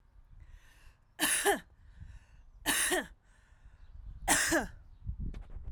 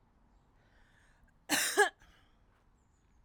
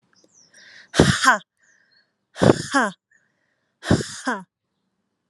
{
  "three_cough_length": "5.7 s",
  "three_cough_amplitude": 7772,
  "three_cough_signal_mean_std_ratio": 0.5,
  "cough_length": "3.2 s",
  "cough_amplitude": 7078,
  "cough_signal_mean_std_ratio": 0.27,
  "exhalation_length": "5.3 s",
  "exhalation_amplitude": 32767,
  "exhalation_signal_mean_std_ratio": 0.32,
  "survey_phase": "alpha (2021-03-01 to 2021-08-12)",
  "age": "18-44",
  "gender": "Female",
  "wearing_mask": "No",
  "symptom_none": true,
  "smoker_status": "Ex-smoker",
  "respiratory_condition_asthma": false,
  "respiratory_condition_other": false,
  "recruitment_source": "REACT",
  "submission_delay": "1 day",
  "covid_test_result": "Negative",
  "covid_test_method": "RT-qPCR"
}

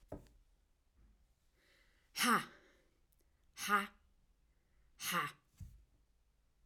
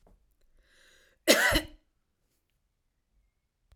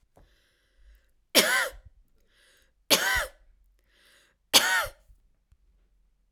{
  "exhalation_length": "6.7 s",
  "exhalation_amplitude": 3287,
  "exhalation_signal_mean_std_ratio": 0.3,
  "cough_length": "3.8 s",
  "cough_amplitude": 16607,
  "cough_signal_mean_std_ratio": 0.24,
  "three_cough_length": "6.3 s",
  "three_cough_amplitude": 22968,
  "three_cough_signal_mean_std_ratio": 0.31,
  "survey_phase": "alpha (2021-03-01 to 2021-08-12)",
  "age": "45-64",
  "gender": "Female",
  "wearing_mask": "No",
  "symptom_none": true,
  "smoker_status": "Never smoked",
  "respiratory_condition_asthma": false,
  "respiratory_condition_other": false,
  "recruitment_source": "REACT",
  "submission_delay": "2 days",
  "covid_test_result": "Negative",
  "covid_test_method": "RT-qPCR"
}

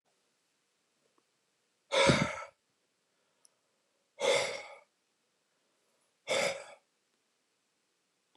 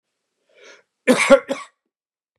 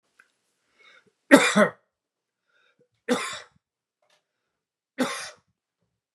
{
  "exhalation_length": "8.4 s",
  "exhalation_amplitude": 9158,
  "exhalation_signal_mean_std_ratio": 0.29,
  "cough_length": "2.4 s",
  "cough_amplitude": 32767,
  "cough_signal_mean_std_ratio": 0.28,
  "three_cough_length": "6.1 s",
  "three_cough_amplitude": 32258,
  "three_cough_signal_mean_std_ratio": 0.23,
  "survey_phase": "beta (2021-08-13 to 2022-03-07)",
  "age": "45-64",
  "gender": "Male",
  "wearing_mask": "No",
  "symptom_none": true,
  "smoker_status": "Never smoked",
  "respiratory_condition_asthma": false,
  "respiratory_condition_other": false,
  "recruitment_source": "REACT",
  "submission_delay": "2 days",
  "covid_test_result": "Negative",
  "covid_test_method": "RT-qPCR"
}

